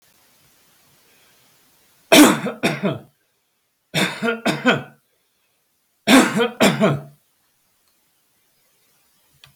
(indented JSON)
{
  "three_cough_length": "9.6 s",
  "three_cough_amplitude": 32768,
  "three_cough_signal_mean_std_ratio": 0.34,
  "survey_phase": "beta (2021-08-13 to 2022-03-07)",
  "age": "65+",
  "gender": "Male",
  "wearing_mask": "No",
  "symptom_none": true,
  "smoker_status": "Never smoked",
  "respiratory_condition_asthma": false,
  "respiratory_condition_other": false,
  "recruitment_source": "REACT",
  "submission_delay": "1 day",
  "covid_test_result": "Negative",
  "covid_test_method": "RT-qPCR",
  "influenza_a_test_result": "Negative",
  "influenza_b_test_result": "Negative"
}